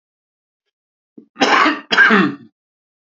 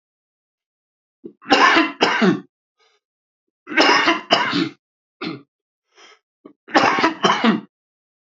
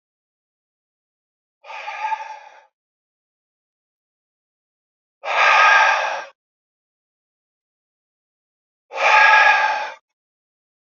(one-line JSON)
{"cough_length": "3.2 s", "cough_amplitude": 32047, "cough_signal_mean_std_ratio": 0.41, "three_cough_length": "8.3 s", "three_cough_amplitude": 32767, "three_cough_signal_mean_std_ratio": 0.44, "exhalation_length": "10.9 s", "exhalation_amplitude": 28062, "exhalation_signal_mean_std_ratio": 0.35, "survey_phase": "beta (2021-08-13 to 2022-03-07)", "age": "45-64", "gender": "Male", "wearing_mask": "No", "symptom_runny_or_blocked_nose": true, "symptom_fatigue": true, "symptom_fever_high_temperature": true, "smoker_status": "Current smoker (11 or more cigarettes per day)", "respiratory_condition_asthma": false, "respiratory_condition_other": false, "recruitment_source": "Test and Trace", "submission_delay": "2 days", "covid_test_result": "Positive", "covid_test_method": "RT-qPCR"}